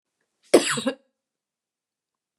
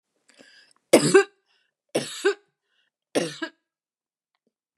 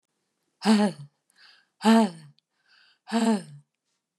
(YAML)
cough_length: 2.4 s
cough_amplitude: 29645
cough_signal_mean_std_ratio: 0.24
three_cough_length: 4.8 s
three_cough_amplitude: 29943
three_cough_signal_mean_std_ratio: 0.26
exhalation_length: 4.2 s
exhalation_amplitude: 13239
exhalation_signal_mean_std_ratio: 0.39
survey_phase: beta (2021-08-13 to 2022-03-07)
age: 45-64
gender: Female
wearing_mask: 'No'
symptom_none: true
smoker_status: Never smoked
respiratory_condition_asthma: false
respiratory_condition_other: false
recruitment_source: REACT
submission_delay: 2 days
covid_test_result: Negative
covid_test_method: RT-qPCR